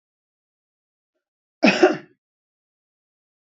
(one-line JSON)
{"cough_length": "3.4 s", "cough_amplitude": 26162, "cough_signal_mean_std_ratio": 0.21, "survey_phase": "beta (2021-08-13 to 2022-03-07)", "age": "65+", "gender": "Male", "wearing_mask": "No", "symptom_none": true, "smoker_status": "Ex-smoker", "respiratory_condition_asthma": false, "respiratory_condition_other": false, "recruitment_source": "REACT", "submission_delay": "2 days", "covid_test_result": "Negative", "covid_test_method": "RT-qPCR"}